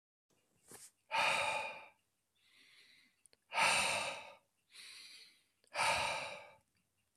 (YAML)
exhalation_length: 7.2 s
exhalation_amplitude: 3274
exhalation_signal_mean_std_ratio: 0.44
survey_phase: beta (2021-08-13 to 2022-03-07)
age: 45-64
gender: Male
wearing_mask: 'No'
symptom_cough_any: true
symptom_sore_throat: true
symptom_onset: 5 days
smoker_status: Never smoked
respiratory_condition_asthma: false
respiratory_condition_other: false
recruitment_source: Test and Trace
submission_delay: 2 days
covid_test_result: Negative
covid_test_method: RT-qPCR